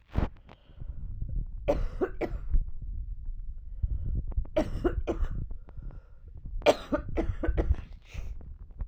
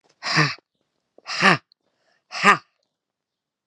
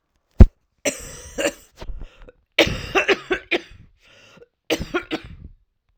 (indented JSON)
{
  "three_cough_length": "8.9 s",
  "three_cough_amplitude": 13698,
  "three_cough_signal_mean_std_ratio": 0.74,
  "exhalation_length": "3.7 s",
  "exhalation_amplitude": 32767,
  "exhalation_signal_mean_std_ratio": 0.31,
  "cough_length": "6.0 s",
  "cough_amplitude": 32768,
  "cough_signal_mean_std_ratio": 0.28,
  "survey_phase": "alpha (2021-03-01 to 2021-08-12)",
  "age": "45-64",
  "gender": "Female",
  "wearing_mask": "No",
  "symptom_cough_any": true,
  "symptom_new_continuous_cough": true,
  "symptom_shortness_of_breath": true,
  "symptom_fatigue": true,
  "symptom_fever_high_temperature": true,
  "symptom_headache": true,
  "symptom_change_to_sense_of_smell_or_taste": true,
  "symptom_loss_of_taste": true,
  "symptom_onset": "6 days",
  "smoker_status": "Never smoked",
  "respiratory_condition_asthma": false,
  "respiratory_condition_other": false,
  "recruitment_source": "Test and Trace",
  "submission_delay": "1 day",
  "covid_test_result": "Positive",
  "covid_test_method": "RT-qPCR",
  "covid_ct_value": 14.1,
  "covid_ct_gene": "ORF1ab gene",
  "covid_ct_mean": 14.6,
  "covid_viral_load": "16000000 copies/ml",
  "covid_viral_load_category": "High viral load (>1M copies/ml)"
}